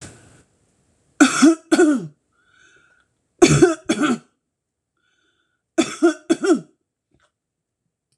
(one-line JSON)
{"three_cough_length": "8.2 s", "three_cough_amplitude": 26028, "three_cough_signal_mean_std_ratio": 0.36, "survey_phase": "beta (2021-08-13 to 2022-03-07)", "age": "45-64", "gender": "Female", "wearing_mask": "No", "symptom_none": true, "smoker_status": "Never smoked", "respiratory_condition_asthma": false, "respiratory_condition_other": false, "recruitment_source": "REACT", "submission_delay": "1 day", "covid_test_result": "Negative", "covid_test_method": "RT-qPCR"}